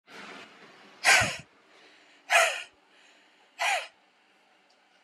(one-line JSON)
{"exhalation_length": "5.0 s", "exhalation_amplitude": 13248, "exhalation_signal_mean_std_ratio": 0.33, "survey_phase": "beta (2021-08-13 to 2022-03-07)", "age": "18-44", "gender": "Female", "wearing_mask": "No", "symptom_none": true, "smoker_status": "Never smoked", "respiratory_condition_asthma": true, "respiratory_condition_other": false, "recruitment_source": "REACT", "submission_delay": "0 days", "covid_test_result": "Negative", "covid_test_method": "RT-qPCR"}